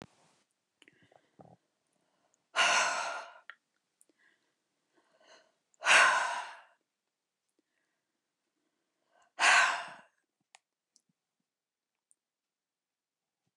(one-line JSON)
{"exhalation_length": "13.6 s", "exhalation_amplitude": 10248, "exhalation_signal_mean_std_ratio": 0.26, "survey_phase": "beta (2021-08-13 to 2022-03-07)", "age": "65+", "gender": "Female", "wearing_mask": "No", "symptom_runny_or_blocked_nose": true, "symptom_abdominal_pain": true, "symptom_onset": "12 days", "smoker_status": "Never smoked", "respiratory_condition_asthma": false, "respiratory_condition_other": false, "recruitment_source": "REACT", "submission_delay": "1 day", "covid_test_result": "Negative", "covid_test_method": "RT-qPCR", "influenza_a_test_result": "Negative", "influenza_b_test_result": "Negative"}